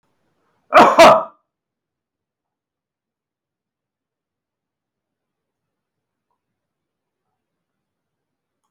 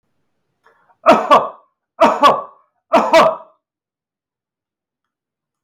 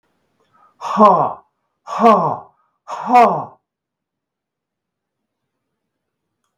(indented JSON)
{
  "cough_length": "8.7 s",
  "cough_amplitude": 32768,
  "cough_signal_mean_std_ratio": 0.19,
  "three_cough_length": "5.6 s",
  "three_cough_amplitude": 32768,
  "three_cough_signal_mean_std_ratio": 0.36,
  "exhalation_length": "6.6 s",
  "exhalation_amplitude": 32768,
  "exhalation_signal_mean_std_ratio": 0.34,
  "survey_phase": "alpha (2021-03-01 to 2021-08-12)",
  "age": "65+",
  "gender": "Male",
  "wearing_mask": "No",
  "symptom_none": true,
  "smoker_status": "Never smoked",
  "respiratory_condition_asthma": false,
  "respiratory_condition_other": false,
  "recruitment_source": "REACT",
  "submission_delay": "1 day",
  "covid_test_result": "Negative",
  "covid_test_method": "RT-qPCR"
}